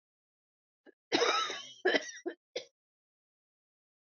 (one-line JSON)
{"cough_length": "4.0 s", "cough_amplitude": 7486, "cough_signal_mean_std_ratio": 0.34, "survey_phase": "beta (2021-08-13 to 2022-03-07)", "age": "18-44", "gender": "Female", "wearing_mask": "No", "symptom_cough_any": true, "symptom_runny_or_blocked_nose": true, "symptom_sore_throat": true, "symptom_fatigue": true, "symptom_headache": true, "symptom_loss_of_taste": true, "smoker_status": "Never smoked", "respiratory_condition_asthma": false, "respiratory_condition_other": false, "recruitment_source": "Test and Trace", "submission_delay": "2 days", "covid_test_result": "Positive", "covid_test_method": "RT-qPCR"}